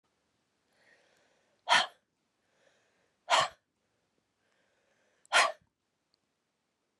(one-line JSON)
{"exhalation_length": "7.0 s", "exhalation_amplitude": 10054, "exhalation_signal_mean_std_ratio": 0.22, "survey_phase": "beta (2021-08-13 to 2022-03-07)", "age": "45-64", "gender": "Female", "wearing_mask": "No", "symptom_new_continuous_cough": true, "symptom_runny_or_blocked_nose": true, "symptom_fatigue": true, "symptom_headache": true, "symptom_change_to_sense_of_smell_or_taste": true, "symptom_loss_of_taste": true, "symptom_onset": "5 days", "smoker_status": "Never smoked", "respiratory_condition_asthma": true, "respiratory_condition_other": false, "recruitment_source": "Test and Trace", "submission_delay": "4 days", "covid_test_result": "Positive", "covid_test_method": "ePCR"}